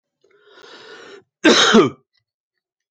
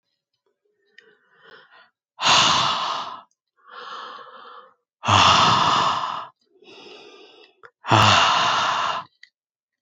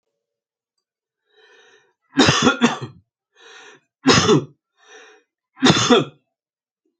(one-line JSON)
{"cough_length": "2.9 s", "cough_amplitude": 28204, "cough_signal_mean_std_ratio": 0.34, "exhalation_length": "9.8 s", "exhalation_amplitude": 26476, "exhalation_signal_mean_std_ratio": 0.48, "three_cough_length": "7.0 s", "three_cough_amplitude": 29856, "three_cough_signal_mean_std_ratio": 0.35, "survey_phase": "alpha (2021-03-01 to 2021-08-12)", "age": "45-64", "gender": "Male", "wearing_mask": "No", "symptom_none": true, "smoker_status": "Ex-smoker", "respiratory_condition_asthma": false, "respiratory_condition_other": false, "recruitment_source": "REACT", "submission_delay": "2 days", "covid_test_result": "Negative", "covid_test_method": "RT-qPCR"}